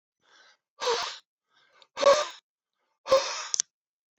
{"exhalation_length": "4.2 s", "exhalation_amplitude": 24119, "exhalation_signal_mean_std_ratio": 0.33, "survey_phase": "alpha (2021-03-01 to 2021-08-12)", "age": "65+", "gender": "Male", "wearing_mask": "No", "symptom_none": true, "smoker_status": "Ex-smoker", "respiratory_condition_asthma": false, "respiratory_condition_other": false, "recruitment_source": "REACT", "submission_delay": "1 day", "covid_test_result": "Negative", "covid_test_method": "RT-qPCR"}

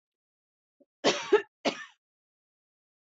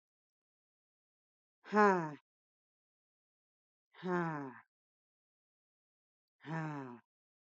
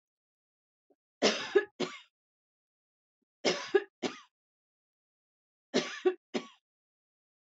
{"cough_length": "3.2 s", "cough_amplitude": 10266, "cough_signal_mean_std_ratio": 0.25, "exhalation_length": "7.6 s", "exhalation_amplitude": 6274, "exhalation_signal_mean_std_ratio": 0.25, "three_cough_length": "7.5 s", "three_cough_amplitude": 7647, "three_cough_signal_mean_std_ratio": 0.27, "survey_phase": "beta (2021-08-13 to 2022-03-07)", "age": "45-64", "gender": "Female", "wearing_mask": "No", "symptom_none": true, "smoker_status": "Never smoked", "respiratory_condition_asthma": false, "respiratory_condition_other": false, "recruitment_source": "REACT", "submission_delay": "2 days", "covid_test_result": "Negative", "covid_test_method": "RT-qPCR", "influenza_a_test_result": "Negative", "influenza_b_test_result": "Negative"}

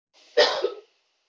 {"three_cough_length": "1.3 s", "three_cough_amplitude": 16296, "three_cough_signal_mean_std_ratio": 0.38, "survey_phase": "beta (2021-08-13 to 2022-03-07)", "age": "18-44", "gender": "Female", "wearing_mask": "No", "symptom_none": true, "smoker_status": "Never smoked", "respiratory_condition_asthma": false, "respiratory_condition_other": false, "recruitment_source": "REACT", "submission_delay": "1 day", "covid_test_result": "Negative", "covid_test_method": "RT-qPCR"}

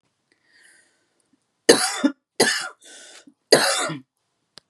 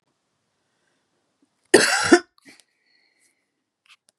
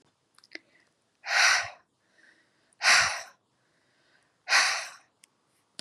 {"three_cough_length": "4.7 s", "three_cough_amplitude": 32768, "three_cough_signal_mean_std_ratio": 0.33, "cough_length": "4.2 s", "cough_amplitude": 32768, "cough_signal_mean_std_ratio": 0.22, "exhalation_length": "5.8 s", "exhalation_amplitude": 12858, "exhalation_signal_mean_std_ratio": 0.34, "survey_phase": "beta (2021-08-13 to 2022-03-07)", "age": "45-64", "gender": "Female", "wearing_mask": "No", "symptom_cough_any": true, "symptom_runny_or_blocked_nose": true, "symptom_other": true, "symptom_onset": "3 days", "smoker_status": "Current smoker (e-cigarettes or vapes only)", "respiratory_condition_asthma": false, "respiratory_condition_other": false, "recruitment_source": "Test and Trace", "submission_delay": "2 days", "covid_test_result": "Positive", "covid_test_method": "RT-qPCR", "covid_ct_value": 28.9, "covid_ct_gene": "N gene", "covid_ct_mean": 29.1, "covid_viral_load": "290 copies/ml", "covid_viral_load_category": "Minimal viral load (< 10K copies/ml)"}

